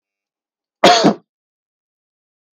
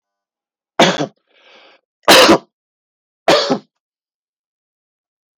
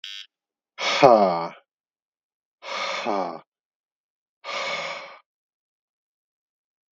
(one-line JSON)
{"cough_length": "2.6 s", "cough_amplitude": 32768, "cough_signal_mean_std_ratio": 0.27, "three_cough_length": "5.4 s", "three_cough_amplitude": 32768, "three_cough_signal_mean_std_ratio": 0.31, "exhalation_length": "6.9 s", "exhalation_amplitude": 32766, "exhalation_signal_mean_std_ratio": 0.32, "survey_phase": "beta (2021-08-13 to 2022-03-07)", "age": "45-64", "gender": "Male", "wearing_mask": "No", "symptom_cough_any": true, "symptom_onset": "11 days", "smoker_status": "Never smoked", "respiratory_condition_asthma": false, "respiratory_condition_other": false, "recruitment_source": "REACT", "submission_delay": "1 day", "covid_test_result": "Negative", "covid_test_method": "RT-qPCR", "covid_ct_value": 44.0, "covid_ct_gene": "N gene"}